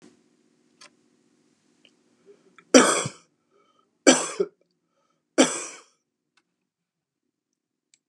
{"three_cough_length": "8.1 s", "three_cough_amplitude": 31835, "three_cough_signal_mean_std_ratio": 0.21, "survey_phase": "beta (2021-08-13 to 2022-03-07)", "age": "65+", "gender": "Male", "wearing_mask": "No", "symptom_runny_or_blocked_nose": true, "symptom_abdominal_pain": true, "symptom_fatigue": true, "symptom_onset": "12 days", "smoker_status": "Ex-smoker", "respiratory_condition_asthma": false, "respiratory_condition_other": false, "recruitment_source": "REACT", "submission_delay": "4 days", "covid_test_result": "Negative", "covid_test_method": "RT-qPCR", "influenza_a_test_result": "Negative", "influenza_b_test_result": "Negative"}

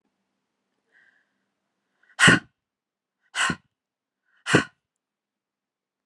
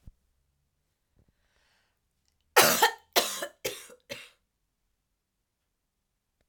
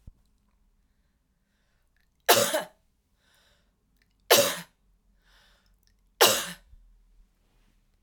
{"exhalation_length": "6.1 s", "exhalation_amplitude": 27077, "exhalation_signal_mean_std_ratio": 0.21, "cough_length": "6.5 s", "cough_amplitude": 22138, "cough_signal_mean_std_ratio": 0.23, "three_cough_length": "8.0 s", "three_cough_amplitude": 21624, "three_cough_signal_mean_std_ratio": 0.24, "survey_phase": "alpha (2021-03-01 to 2021-08-12)", "age": "18-44", "gender": "Female", "wearing_mask": "No", "symptom_fatigue": true, "symptom_headache": true, "symptom_onset": "12 days", "smoker_status": "Never smoked", "respiratory_condition_asthma": false, "respiratory_condition_other": false, "recruitment_source": "REACT", "submission_delay": "1 day", "covid_test_result": "Negative", "covid_test_method": "RT-qPCR"}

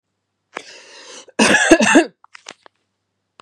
{"cough_length": "3.4 s", "cough_amplitude": 32768, "cough_signal_mean_std_ratio": 0.36, "survey_phase": "beta (2021-08-13 to 2022-03-07)", "age": "45-64", "gender": "Female", "wearing_mask": "No", "symptom_none": true, "smoker_status": "Never smoked", "respiratory_condition_asthma": true, "respiratory_condition_other": false, "recruitment_source": "REACT", "submission_delay": "2 days", "covid_test_result": "Negative", "covid_test_method": "RT-qPCR", "influenza_a_test_result": "Negative", "influenza_b_test_result": "Negative"}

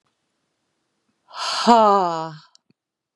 {"exhalation_length": "3.2 s", "exhalation_amplitude": 32432, "exhalation_signal_mean_std_ratio": 0.35, "survey_phase": "beta (2021-08-13 to 2022-03-07)", "age": "45-64", "gender": "Female", "wearing_mask": "No", "symptom_none": true, "smoker_status": "Never smoked", "respiratory_condition_asthma": false, "respiratory_condition_other": false, "recruitment_source": "REACT", "submission_delay": "2 days", "covid_test_result": "Negative", "covid_test_method": "RT-qPCR", "influenza_a_test_result": "Negative", "influenza_b_test_result": "Negative"}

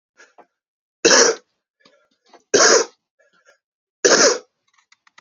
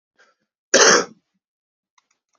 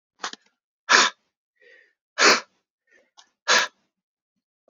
{"three_cough_length": "5.2 s", "three_cough_amplitude": 32767, "three_cough_signal_mean_std_ratio": 0.34, "cough_length": "2.4 s", "cough_amplitude": 31664, "cough_signal_mean_std_ratio": 0.28, "exhalation_length": "4.7 s", "exhalation_amplitude": 29440, "exhalation_signal_mean_std_ratio": 0.28, "survey_phase": "beta (2021-08-13 to 2022-03-07)", "age": "45-64", "gender": "Male", "wearing_mask": "No", "symptom_fatigue": true, "symptom_change_to_sense_of_smell_or_taste": true, "symptom_loss_of_taste": true, "smoker_status": "Ex-smoker", "respiratory_condition_asthma": true, "respiratory_condition_other": false, "recruitment_source": "Test and Trace", "submission_delay": "1 day", "covid_test_result": "Positive", "covid_test_method": "RT-qPCR"}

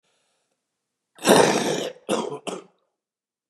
{"cough_length": "3.5 s", "cough_amplitude": 29877, "cough_signal_mean_std_ratio": 0.37, "survey_phase": "beta (2021-08-13 to 2022-03-07)", "age": "65+", "gender": "Male", "wearing_mask": "No", "symptom_cough_any": true, "symptom_fatigue": true, "symptom_onset": "8 days", "smoker_status": "Never smoked", "respiratory_condition_asthma": true, "respiratory_condition_other": false, "recruitment_source": "REACT", "submission_delay": "3 days", "covid_test_result": "Negative", "covid_test_method": "RT-qPCR", "influenza_a_test_result": "Negative", "influenza_b_test_result": "Negative"}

